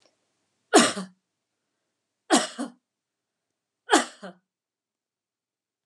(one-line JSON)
{"three_cough_length": "5.9 s", "three_cough_amplitude": 24417, "three_cough_signal_mean_std_ratio": 0.23, "survey_phase": "beta (2021-08-13 to 2022-03-07)", "age": "45-64", "gender": "Female", "wearing_mask": "No", "symptom_none": true, "smoker_status": "Never smoked", "respiratory_condition_asthma": false, "respiratory_condition_other": false, "recruitment_source": "REACT", "submission_delay": "2 days", "covid_test_result": "Negative", "covid_test_method": "RT-qPCR", "influenza_a_test_result": "Negative", "influenza_b_test_result": "Negative"}